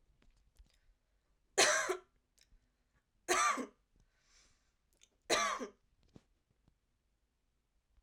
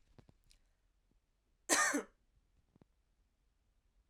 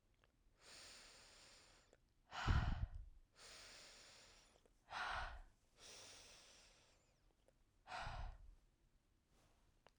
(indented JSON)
{
  "three_cough_length": "8.0 s",
  "three_cough_amplitude": 5824,
  "three_cough_signal_mean_std_ratio": 0.29,
  "cough_length": "4.1 s",
  "cough_amplitude": 5455,
  "cough_signal_mean_std_ratio": 0.24,
  "exhalation_length": "10.0 s",
  "exhalation_amplitude": 1757,
  "exhalation_signal_mean_std_ratio": 0.38,
  "survey_phase": "beta (2021-08-13 to 2022-03-07)",
  "age": "18-44",
  "gender": "Female",
  "wearing_mask": "No",
  "symptom_headache": true,
  "symptom_onset": "3 days",
  "smoker_status": "Never smoked",
  "respiratory_condition_asthma": false,
  "respiratory_condition_other": false,
  "recruitment_source": "Test and Trace",
  "submission_delay": "1 day",
  "covid_test_result": "Positive",
  "covid_test_method": "RT-qPCR",
  "covid_ct_value": 29.8,
  "covid_ct_gene": "N gene"
}